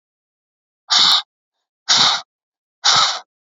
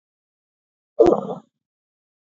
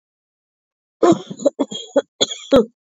{"exhalation_length": "3.5 s", "exhalation_amplitude": 32767, "exhalation_signal_mean_std_ratio": 0.43, "cough_length": "2.3 s", "cough_amplitude": 26326, "cough_signal_mean_std_ratio": 0.25, "three_cough_length": "2.9 s", "three_cough_amplitude": 27270, "three_cough_signal_mean_std_ratio": 0.36, "survey_phase": "beta (2021-08-13 to 2022-03-07)", "age": "18-44", "gender": "Female", "wearing_mask": "No", "symptom_none": true, "smoker_status": "Never smoked", "respiratory_condition_asthma": false, "respiratory_condition_other": false, "recruitment_source": "REACT", "submission_delay": "2 days", "covid_test_result": "Negative", "covid_test_method": "RT-qPCR"}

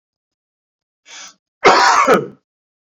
{"cough_length": "2.8 s", "cough_amplitude": 29989, "cough_signal_mean_std_ratio": 0.39, "survey_phase": "beta (2021-08-13 to 2022-03-07)", "age": "45-64", "gender": "Male", "wearing_mask": "No", "symptom_cough_any": true, "symptom_fatigue": true, "smoker_status": "Never smoked", "respiratory_condition_asthma": false, "respiratory_condition_other": false, "recruitment_source": "Test and Trace", "submission_delay": "1 day", "covid_test_result": "Positive", "covid_test_method": "RT-qPCR"}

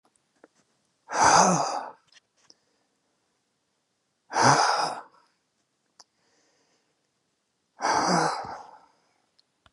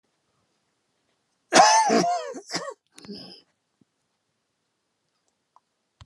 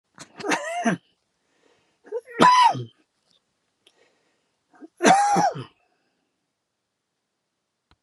{"exhalation_length": "9.7 s", "exhalation_amplitude": 20669, "exhalation_signal_mean_std_ratio": 0.35, "cough_length": "6.1 s", "cough_amplitude": 25876, "cough_signal_mean_std_ratio": 0.3, "three_cough_length": "8.0 s", "three_cough_amplitude": 29823, "three_cough_signal_mean_std_ratio": 0.34, "survey_phase": "alpha (2021-03-01 to 2021-08-12)", "age": "65+", "gender": "Male", "wearing_mask": "No", "symptom_cough_any": true, "symptom_shortness_of_breath": true, "smoker_status": "Ex-smoker", "respiratory_condition_asthma": false, "respiratory_condition_other": true, "recruitment_source": "REACT", "submission_delay": "2 days", "covid_test_result": "Negative", "covid_test_method": "RT-qPCR"}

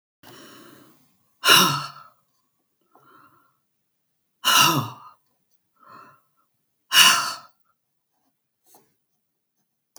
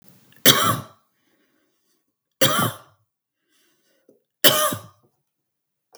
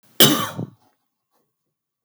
{"exhalation_length": "10.0 s", "exhalation_amplitude": 32766, "exhalation_signal_mean_std_ratio": 0.27, "three_cough_length": "6.0 s", "three_cough_amplitude": 32768, "three_cough_signal_mean_std_ratio": 0.29, "cough_length": "2.0 s", "cough_amplitude": 32768, "cough_signal_mean_std_ratio": 0.28, "survey_phase": "beta (2021-08-13 to 2022-03-07)", "age": "65+", "gender": "Female", "wearing_mask": "No", "symptom_none": true, "smoker_status": "Ex-smoker", "respiratory_condition_asthma": false, "respiratory_condition_other": false, "recruitment_source": "REACT", "submission_delay": "1 day", "covid_test_result": "Negative", "covid_test_method": "RT-qPCR", "influenza_a_test_result": "Negative", "influenza_b_test_result": "Negative"}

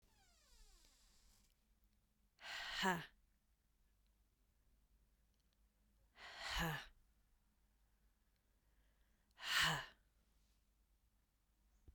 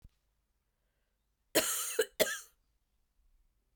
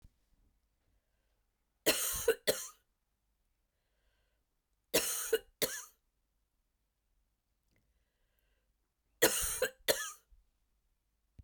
{"exhalation_length": "11.9 s", "exhalation_amplitude": 1905, "exhalation_signal_mean_std_ratio": 0.3, "cough_length": "3.8 s", "cough_amplitude": 7654, "cough_signal_mean_std_ratio": 0.3, "three_cough_length": "11.4 s", "three_cough_amplitude": 9384, "three_cough_signal_mean_std_ratio": 0.28, "survey_phase": "beta (2021-08-13 to 2022-03-07)", "age": "45-64", "gender": "Female", "wearing_mask": "No", "symptom_cough_any": true, "symptom_sore_throat": true, "symptom_fatigue": true, "symptom_headache": true, "symptom_onset": "3 days", "smoker_status": "Never smoked", "respiratory_condition_asthma": false, "respiratory_condition_other": false, "recruitment_source": "Test and Trace", "submission_delay": "1 day", "covid_test_result": "Positive", "covid_test_method": "RT-qPCR", "covid_ct_value": 27.2, "covid_ct_gene": "ORF1ab gene", "covid_ct_mean": 27.4, "covid_viral_load": "1000 copies/ml", "covid_viral_load_category": "Minimal viral load (< 10K copies/ml)"}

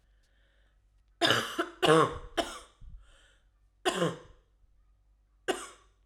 {"three_cough_length": "6.1 s", "three_cough_amplitude": 11772, "three_cough_signal_mean_std_ratio": 0.35, "survey_phase": "alpha (2021-03-01 to 2021-08-12)", "age": "18-44", "gender": "Female", "wearing_mask": "No", "symptom_new_continuous_cough": true, "symptom_fatigue": true, "symptom_fever_high_temperature": true, "symptom_headache": true, "symptom_change_to_sense_of_smell_or_taste": true, "symptom_loss_of_taste": true, "symptom_onset": "3 days", "smoker_status": "Never smoked", "respiratory_condition_asthma": false, "respiratory_condition_other": false, "recruitment_source": "Test and Trace", "submission_delay": "1 day", "covid_test_result": "Positive", "covid_test_method": "RT-qPCR", "covid_ct_value": 16.3, "covid_ct_gene": "ORF1ab gene", "covid_ct_mean": 16.6, "covid_viral_load": "3600000 copies/ml", "covid_viral_load_category": "High viral load (>1M copies/ml)"}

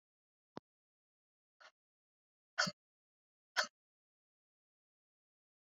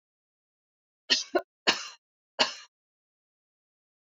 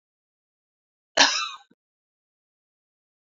{"exhalation_length": "5.7 s", "exhalation_amplitude": 3073, "exhalation_signal_mean_std_ratio": 0.14, "three_cough_length": "4.0 s", "three_cough_amplitude": 13384, "three_cough_signal_mean_std_ratio": 0.24, "cough_length": "3.2 s", "cough_amplitude": 24868, "cough_signal_mean_std_ratio": 0.21, "survey_phase": "beta (2021-08-13 to 2022-03-07)", "age": "45-64", "gender": "Female", "wearing_mask": "No", "symptom_none": true, "smoker_status": "Ex-smoker", "respiratory_condition_asthma": false, "respiratory_condition_other": false, "recruitment_source": "REACT", "submission_delay": "3 days", "covid_test_result": "Negative", "covid_test_method": "RT-qPCR"}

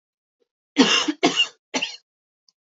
{"three_cough_length": "2.7 s", "three_cough_amplitude": 27305, "three_cough_signal_mean_std_ratio": 0.38, "survey_phase": "beta (2021-08-13 to 2022-03-07)", "age": "18-44", "gender": "Female", "wearing_mask": "No", "symptom_none": true, "smoker_status": "Never smoked", "respiratory_condition_asthma": false, "respiratory_condition_other": false, "recruitment_source": "REACT", "submission_delay": "2 days", "covid_test_result": "Negative", "covid_test_method": "RT-qPCR", "influenza_a_test_result": "Negative", "influenza_b_test_result": "Negative"}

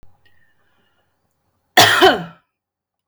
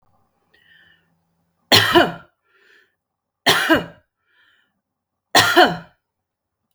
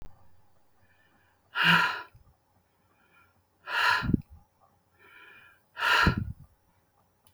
{"cough_length": "3.1 s", "cough_amplitude": 32768, "cough_signal_mean_std_ratio": 0.3, "three_cough_length": "6.7 s", "three_cough_amplitude": 32768, "three_cough_signal_mean_std_ratio": 0.31, "exhalation_length": "7.3 s", "exhalation_amplitude": 12554, "exhalation_signal_mean_std_ratio": 0.36, "survey_phase": "beta (2021-08-13 to 2022-03-07)", "age": "45-64", "gender": "Female", "wearing_mask": "No", "symptom_none": true, "symptom_onset": "3 days", "smoker_status": "Ex-smoker", "respiratory_condition_asthma": false, "respiratory_condition_other": false, "recruitment_source": "REACT", "submission_delay": "1 day", "covid_test_result": "Negative", "covid_test_method": "RT-qPCR"}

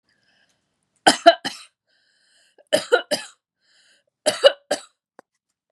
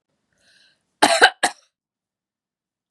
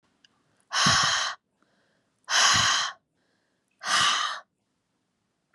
{"three_cough_length": "5.7 s", "three_cough_amplitude": 32768, "three_cough_signal_mean_std_ratio": 0.24, "cough_length": "2.9 s", "cough_amplitude": 32767, "cough_signal_mean_std_ratio": 0.24, "exhalation_length": "5.5 s", "exhalation_amplitude": 14286, "exhalation_signal_mean_std_ratio": 0.47, "survey_phase": "beta (2021-08-13 to 2022-03-07)", "age": "45-64", "gender": "Female", "wearing_mask": "No", "symptom_abdominal_pain": true, "symptom_onset": "5 days", "smoker_status": "Never smoked", "respiratory_condition_asthma": false, "respiratory_condition_other": false, "recruitment_source": "REACT", "submission_delay": "1 day", "covid_test_result": "Negative", "covid_test_method": "RT-qPCR", "influenza_a_test_result": "Negative", "influenza_b_test_result": "Negative"}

